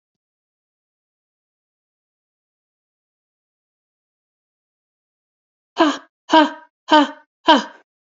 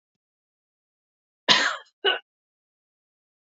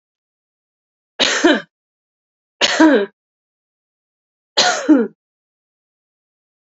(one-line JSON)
{"exhalation_length": "8.0 s", "exhalation_amplitude": 32768, "exhalation_signal_mean_std_ratio": 0.22, "cough_length": "3.4 s", "cough_amplitude": 27423, "cough_signal_mean_std_ratio": 0.25, "three_cough_length": "6.7 s", "three_cough_amplitude": 32681, "three_cough_signal_mean_std_ratio": 0.33, "survey_phase": "beta (2021-08-13 to 2022-03-07)", "age": "45-64", "gender": "Female", "wearing_mask": "No", "symptom_none": true, "smoker_status": "Never smoked", "respiratory_condition_asthma": false, "respiratory_condition_other": false, "recruitment_source": "REACT", "submission_delay": "4 days", "covid_test_result": "Negative", "covid_test_method": "RT-qPCR", "influenza_a_test_result": "Negative", "influenza_b_test_result": "Negative"}